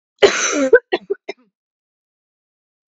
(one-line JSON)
{"cough_length": "3.0 s", "cough_amplitude": 32767, "cough_signal_mean_std_ratio": 0.32, "survey_phase": "beta (2021-08-13 to 2022-03-07)", "age": "18-44", "gender": "Female", "wearing_mask": "No", "symptom_none": true, "symptom_onset": "4 days", "smoker_status": "Never smoked", "respiratory_condition_asthma": false, "respiratory_condition_other": false, "recruitment_source": "REACT", "submission_delay": "1 day", "covid_test_result": "Negative", "covid_test_method": "RT-qPCR", "influenza_a_test_result": "Negative", "influenza_b_test_result": "Negative"}